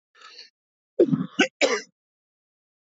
cough_length: 2.8 s
cough_amplitude: 15265
cough_signal_mean_std_ratio: 0.32
survey_phase: beta (2021-08-13 to 2022-03-07)
age: 45-64
gender: Male
wearing_mask: 'No'
symptom_cough_any: true
symptom_new_continuous_cough: true
symptom_runny_or_blocked_nose: true
symptom_shortness_of_breath: true
symptom_sore_throat: true
symptom_fatigue: true
symptom_fever_high_temperature: true
symptom_headache: true
symptom_change_to_sense_of_smell_or_taste: true
smoker_status: Ex-smoker
respiratory_condition_asthma: true
respiratory_condition_other: false
recruitment_source: Test and Trace
submission_delay: 2 days
covid_test_result: Positive
covid_test_method: RT-qPCR
covid_ct_value: 24.7
covid_ct_gene: ORF1ab gene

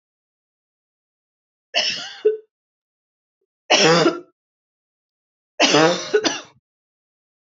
three_cough_length: 7.5 s
three_cough_amplitude: 30702
three_cough_signal_mean_std_ratio: 0.35
survey_phase: beta (2021-08-13 to 2022-03-07)
age: 18-44
gender: Female
wearing_mask: 'No'
symptom_fatigue: true
smoker_status: Ex-smoker
respiratory_condition_asthma: false
respiratory_condition_other: false
recruitment_source: REACT
submission_delay: 1 day
covid_test_result: Negative
covid_test_method: RT-qPCR
influenza_a_test_result: Unknown/Void
influenza_b_test_result: Unknown/Void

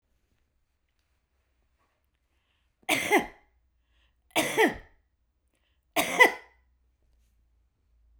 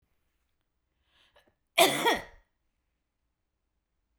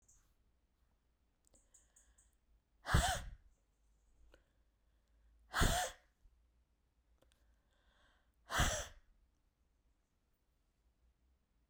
three_cough_length: 8.2 s
three_cough_amplitude: 20206
three_cough_signal_mean_std_ratio: 0.25
cough_length: 4.2 s
cough_amplitude: 13332
cough_signal_mean_std_ratio: 0.23
exhalation_length: 11.7 s
exhalation_amplitude: 3827
exhalation_signal_mean_std_ratio: 0.25
survey_phase: beta (2021-08-13 to 2022-03-07)
age: 65+
gender: Female
wearing_mask: 'No'
symptom_none: true
smoker_status: Never smoked
respiratory_condition_asthma: false
respiratory_condition_other: false
recruitment_source: REACT
submission_delay: 2 days
covid_test_result: Negative
covid_test_method: RT-qPCR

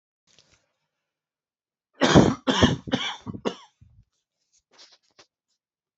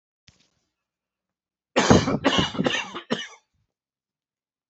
three_cough_length: 6.0 s
three_cough_amplitude: 27456
three_cough_signal_mean_std_ratio: 0.27
cough_length: 4.7 s
cough_amplitude: 27146
cough_signal_mean_std_ratio: 0.34
survey_phase: alpha (2021-03-01 to 2021-08-12)
age: 45-64
gender: Male
wearing_mask: 'No'
symptom_cough_any: true
symptom_change_to_sense_of_smell_or_taste: true
symptom_loss_of_taste: true
symptom_onset: 4 days
smoker_status: Never smoked
respiratory_condition_asthma: false
respiratory_condition_other: false
recruitment_source: Test and Trace
submission_delay: 2 days
covid_test_result: Positive
covid_test_method: RT-qPCR
covid_ct_value: 17.5
covid_ct_gene: N gene
covid_ct_mean: 17.5
covid_viral_load: 1800000 copies/ml
covid_viral_load_category: High viral load (>1M copies/ml)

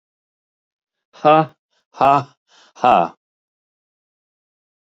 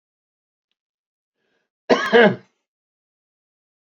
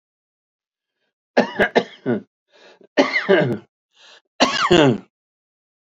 exhalation_length: 4.9 s
exhalation_amplitude: 29320
exhalation_signal_mean_std_ratio: 0.29
cough_length: 3.8 s
cough_amplitude: 30600
cough_signal_mean_std_ratio: 0.24
three_cough_length: 5.9 s
three_cough_amplitude: 32341
three_cough_signal_mean_std_ratio: 0.39
survey_phase: beta (2021-08-13 to 2022-03-07)
age: 65+
gender: Male
wearing_mask: 'No'
symptom_none: true
symptom_onset: 8 days
smoker_status: Ex-smoker
respiratory_condition_asthma: false
respiratory_condition_other: false
recruitment_source: REACT
submission_delay: 2 days
covid_test_result: Negative
covid_test_method: RT-qPCR
influenza_a_test_result: Negative
influenza_b_test_result: Negative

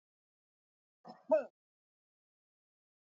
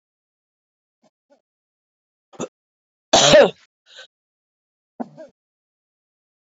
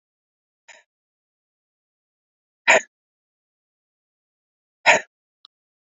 cough_length: 3.2 s
cough_amplitude: 3894
cough_signal_mean_std_ratio: 0.17
three_cough_length: 6.6 s
three_cough_amplitude: 29521
three_cough_signal_mean_std_ratio: 0.2
exhalation_length: 6.0 s
exhalation_amplitude: 28314
exhalation_signal_mean_std_ratio: 0.16
survey_phase: alpha (2021-03-01 to 2021-08-12)
age: 45-64
gender: Female
wearing_mask: 'No'
symptom_none: true
smoker_status: Never smoked
respiratory_condition_asthma: false
respiratory_condition_other: false
recruitment_source: REACT
submission_delay: 3 days
covid_test_result: Negative
covid_test_method: RT-qPCR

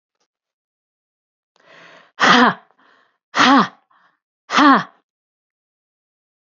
exhalation_length: 6.5 s
exhalation_amplitude: 31503
exhalation_signal_mean_std_ratio: 0.31
survey_phase: beta (2021-08-13 to 2022-03-07)
age: 65+
gender: Female
wearing_mask: 'No'
symptom_runny_or_blocked_nose: true
symptom_sore_throat: true
symptom_onset: 10 days
smoker_status: Never smoked
respiratory_condition_asthma: false
respiratory_condition_other: false
recruitment_source: REACT
submission_delay: 1 day
covid_test_result: Negative
covid_test_method: RT-qPCR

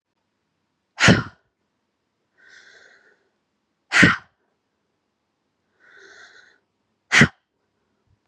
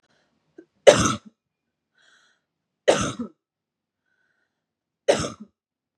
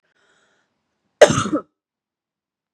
exhalation_length: 8.3 s
exhalation_amplitude: 32406
exhalation_signal_mean_std_ratio: 0.21
three_cough_length: 6.0 s
three_cough_amplitude: 32768
three_cough_signal_mean_std_ratio: 0.23
cough_length: 2.7 s
cough_amplitude: 32768
cough_signal_mean_std_ratio: 0.21
survey_phase: beta (2021-08-13 to 2022-03-07)
age: 18-44
gender: Female
wearing_mask: 'No'
symptom_cough_any: true
symptom_runny_or_blocked_nose: true
symptom_shortness_of_breath: true
symptom_sore_throat: true
symptom_fatigue: true
symptom_fever_high_temperature: true
symptom_headache: true
smoker_status: Ex-smoker
respiratory_condition_asthma: false
respiratory_condition_other: false
recruitment_source: Test and Trace
submission_delay: 0 days
covid_test_result: Negative
covid_test_method: RT-qPCR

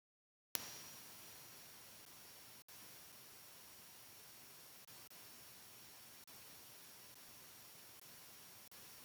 three_cough_length: 9.0 s
three_cough_amplitude: 9617
three_cough_signal_mean_std_ratio: 0.83
survey_phase: beta (2021-08-13 to 2022-03-07)
age: 65+
gender: Male
wearing_mask: 'No'
symptom_none: true
smoker_status: Ex-smoker
respiratory_condition_asthma: false
respiratory_condition_other: false
recruitment_source: REACT
submission_delay: 2 days
covid_test_result: Negative
covid_test_method: RT-qPCR
influenza_a_test_result: Negative
influenza_b_test_result: Negative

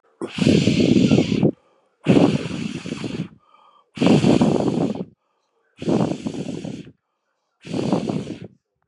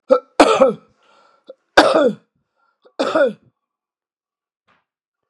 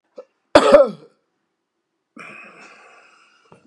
exhalation_length: 8.9 s
exhalation_amplitude: 28047
exhalation_signal_mean_std_ratio: 0.55
three_cough_length: 5.3 s
three_cough_amplitude: 32768
three_cough_signal_mean_std_ratio: 0.35
cough_length: 3.7 s
cough_amplitude: 32768
cough_signal_mean_std_ratio: 0.25
survey_phase: beta (2021-08-13 to 2022-03-07)
age: 65+
gender: Male
wearing_mask: 'Yes'
symptom_cough_any: true
smoker_status: Never smoked
respiratory_condition_asthma: false
respiratory_condition_other: false
recruitment_source: Test and Trace
submission_delay: 2 days
covid_test_result: Positive
covid_test_method: ePCR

